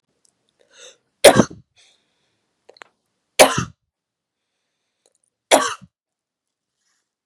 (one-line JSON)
{"three_cough_length": "7.3 s", "three_cough_amplitude": 32768, "three_cough_signal_mean_std_ratio": 0.19, "survey_phase": "beta (2021-08-13 to 2022-03-07)", "age": "18-44", "gender": "Female", "wearing_mask": "No", "symptom_runny_or_blocked_nose": true, "symptom_sore_throat": true, "symptom_headache": true, "symptom_onset": "3 days", "smoker_status": "Never smoked", "respiratory_condition_asthma": false, "respiratory_condition_other": false, "recruitment_source": "Test and Trace", "submission_delay": "2 days", "covid_test_result": "Positive", "covid_test_method": "RT-qPCR"}